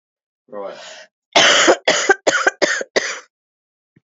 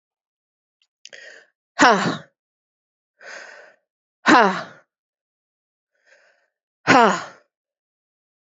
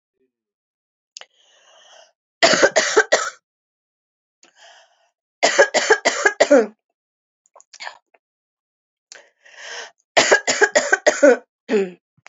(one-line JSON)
{"cough_length": "4.1 s", "cough_amplitude": 30925, "cough_signal_mean_std_ratio": 0.45, "exhalation_length": "8.5 s", "exhalation_amplitude": 32767, "exhalation_signal_mean_std_ratio": 0.25, "three_cough_length": "12.3 s", "three_cough_amplitude": 29824, "three_cough_signal_mean_std_ratio": 0.35, "survey_phase": "beta (2021-08-13 to 2022-03-07)", "age": "45-64", "gender": "Female", "wearing_mask": "No", "symptom_cough_any": true, "symptom_runny_or_blocked_nose": true, "symptom_sore_throat": true, "symptom_diarrhoea": true, "symptom_fatigue": true, "symptom_fever_high_temperature": true, "symptom_headache": true, "symptom_onset": "3 days", "smoker_status": "Never smoked", "respiratory_condition_asthma": true, "respiratory_condition_other": false, "recruitment_source": "Test and Trace", "submission_delay": "2 days", "covid_test_result": "Positive", "covid_test_method": "RT-qPCR", "covid_ct_value": 27.2, "covid_ct_gene": "ORF1ab gene"}